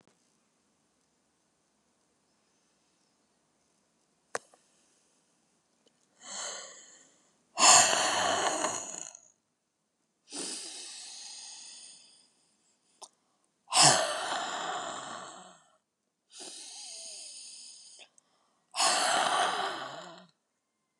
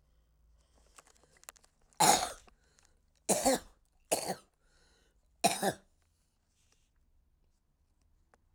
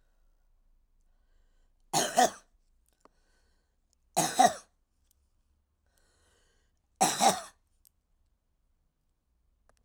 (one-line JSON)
{"exhalation_length": "21.0 s", "exhalation_amplitude": 16091, "exhalation_signal_mean_std_ratio": 0.34, "cough_length": "8.5 s", "cough_amplitude": 10111, "cough_signal_mean_std_ratio": 0.27, "three_cough_length": "9.8 s", "three_cough_amplitude": 12690, "three_cough_signal_mean_std_ratio": 0.24, "survey_phase": "alpha (2021-03-01 to 2021-08-12)", "age": "45-64", "gender": "Female", "wearing_mask": "No", "symptom_cough_any": true, "symptom_fatigue": true, "symptom_headache": true, "symptom_onset": "12 days", "smoker_status": "Current smoker (1 to 10 cigarettes per day)", "respiratory_condition_asthma": false, "respiratory_condition_other": false, "recruitment_source": "REACT", "submission_delay": "2 days", "covid_test_result": "Negative", "covid_test_method": "RT-qPCR"}